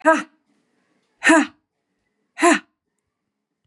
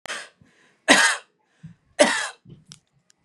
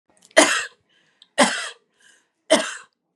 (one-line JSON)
{"exhalation_length": "3.7 s", "exhalation_amplitude": 27325, "exhalation_signal_mean_std_ratio": 0.31, "cough_length": "3.2 s", "cough_amplitude": 30796, "cough_signal_mean_std_ratio": 0.33, "three_cough_length": "3.2 s", "three_cough_amplitude": 32768, "three_cough_signal_mean_std_ratio": 0.34, "survey_phase": "beta (2021-08-13 to 2022-03-07)", "age": "45-64", "gender": "Female", "wearing_mask": "No", "symptom_fatigue": true, "symptom_headache": true, "smoker_status": "Ex-smoker", "respiratory_condition_asthma": false, "respiratory_condition_other": false, "recruitment_source": "REACT", "submission_delay": "1 day", "covid_test_result": "Negative", "covid_test_method": "RT-qPCR", "influenza_a_test_result": "Unknown/Void", "influenza_b_test_result": "Unknown/Void"}